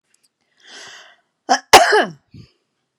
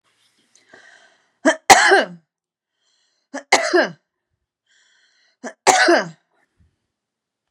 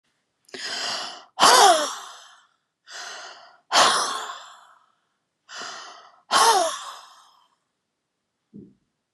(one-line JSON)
{"cough_length": "3.0 s", "cough_amplitude": 32768, "cough_signal_mean_std_ratio": 0.29, "three_cough_length": "7.5 s", "three_cough_amplitude": 32768, "three_cough_signal_mean_std_ratio": 0.31, "exhalation_length": "9.1 s", "exhalation_amplitude": 28886, "exhalation_signal_mean_std_ratio": 0.37, "survey_phase": "beta (2021-08-13 to 2022-03-07)", "age": "65+", "gender": "Female", "wearing_mask": "No", "symptom_none": true, "smoker_status": "Never smoked", "respiratory_condition_asthma": false, "respiratory_condition_other": false, "recruitment_source": "REACT", "submission_delay": "3 days", "covid_test_result": "Negative", "covid_test_method": "RT-qPCR"}